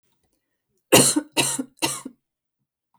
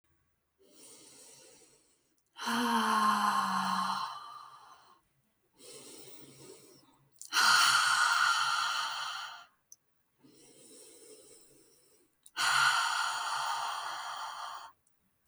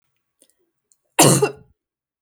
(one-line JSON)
{"three_cough_length": "3.0 s", "three_cough_amplitude": 32766, "three_cough_signal_mean_std_ratio": 0.33, "exhalation_length": "15.3 s", "exhalation_amplitude": 7642, "exhalation_signal_mean_std_ratio": 0.53, "cough_length": "2.2 s", "cough_amplitude": 32768, "cough_signal_mean_std_ratio": 0.29, "survey_phase": "beta (2021-08-13 to 2022-03-07)", "age": "18-44", "gender": "Female", "wearing_mask": "No", "symptom_none": true, "smoker_status": "Ex-smoker", "respiratory_condition_asthma": false, "respiratory_condition_other": false, "recruitment_source": "REACT", "submission_delay": "2 days", "covid_test_result": "Negative", "covid_test_method": "RT-qPCR"}